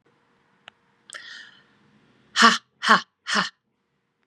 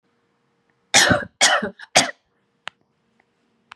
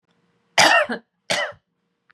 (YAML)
exhalation_length: 4.3 s
exhalation_amplitude: 30732
exhalation_signal_mean_std_ratio: 0.27
three_cough_length: 3.8 s
three_cough_amplitude: 32767
three_cough_signal_mean_std_ratio: 0.32
cough_length: 2.1 s
cough_amplitude: 32767
cough_signal_mean_std_ratio: 0.38
survey_phase: beta (2021-08-13 to 2022-03-07)
age: 45-64
gender: Female
wearing_mask: 'No'
symptom_none: true
smoker_status: Ex-smoker
respiratory_condition_asthma: false
respiratory_condition_other: false
recruitment_source: REACT
submission_delay: 2 days
covid_test_result: Negative
covid_test_method: RT-qPCR
influenza_a_test_result: Negative
influenza_b_test_result: Negative